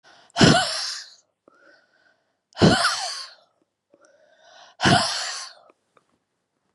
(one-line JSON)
{"exhalation_length": "6.7 s", "exhalation_amplitude": 28294, "exhalation_signal_mean_std_ratio": 0.36, "survey_phase": "beta (2021-08-13 to 2022-03-07)", "age": "45-64", "gender": "Female", "wearing_mask": "No", "symptom_cough_any": true, "symptom_runny_or_blocked_nose": true, "symptom_diarrhoea": true, "symptom_fatigue": true, "symptom_headache": true, "symptom_change_to_sense_of_smell_or_taste": true, "symptom_loss_of_taste": true, "symptom_other": true, "symptom_onset": "3 days", "smoker_status": "Ex-smoker", "respiratory_condition_asthma": false, "respiratory_condition_other": false, "recruitment_source": "Test and Trace", "submission_delay": "1 day", "covid_test_result": "Positive", "covid_test_method": "ePCR"}